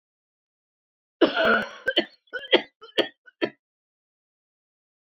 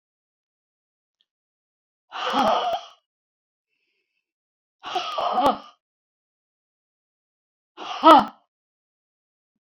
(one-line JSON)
{"cough_length": "5.0 s", "cough_amplitude": 23056, "cough_signal_mean_std_ratio": 0.31, "exhalation_length": "9.6 s", "exhalation_amplitude": 26442, "exhalation_signal_mean_std_ratio": 0.26, "survey_phase": "beta (2021-08-13 to 2022-03-07)", "age": "65+", "gender": "Female", "wearing_mask": "No", "symptom_none": true, "smoker_status": "Never smoked", "respiratory_condition_asthma": false, "respiratory_condition_other": false, "recruitment_source": "REACT", "submission_delay": "1 day", "covid_test_result": "Negative", "covid_test_method": "RT-qPCR"}